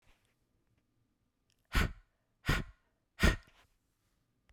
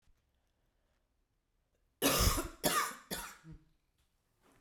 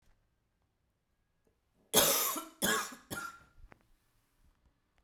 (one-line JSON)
{"exhalation_length": "4.5 s", "exhalation_amplitude": 7445, "exhalation_signal_mean_std_ratio": 0.25, "cough_length": "4.6 s", "cough_amplitude": 5096, "cough_signal_mean_std_ratio": 0.35, "three_cough_length": "5.0 s", "three_cough_amplitude": 8607, "three_cough_signal_mean_std_ratio": 0.33, "survey_phase": "beta (2021-08-13 to 2022-03-07)", "age": "45-64", "gender": "Female", "wearing_mask": "No", "symptom_cough_any": true, "symptom_new_continuous_cough": true, "symptom_runny_or_blocked_nose": true, "symptom_onset": "3 days", "smoker_status": "Never smoked", "respiratory_condition_asthma": false, "respiratory_condition_other": false, "recruitment_source": "Test and Trace", "submission_delay": "1 day", "covid_test_result": "Positive", "covid_test_method": "RT-qPCR"}